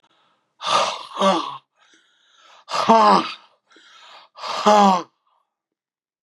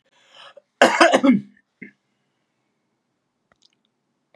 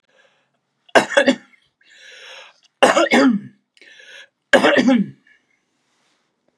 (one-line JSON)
{"exhalation_length": "6.2 s", "exhalation_amplitude": 30529, "exhalation_signal_mean_std_ratio": 0.4, "cough_length": "4.4 s", "cough_amplitude": 32706, "cough_signal_mean_std_ratio": 0.27, "three_cough_length": "6.6 s", "three_cough_amplitude": 32767, "three_cough_signal_mean_std_ratio": 0.37, "survey_phase": "beta (2021-08-13 to 2022-03-07)", "age": "65+", "gender": "Male", "wearing_mask": "No", "symptom_cough_any": true, "symptom_shortness_of_breath": true, "symptom_fatigue": true, "symptom_onset": "2 days", "smoker_status": "Never smoked", "respiratory_condition_asthma": true, "respiratory_condition_other": false, "recruitment_source": "Test and Trace", "submission_delay": "2 days", "covid_test_result": "Positive", "covid_test_method": "RT-qPCR", "covid_ct_value": 26.9, "covid_ct_gene": "N gene"}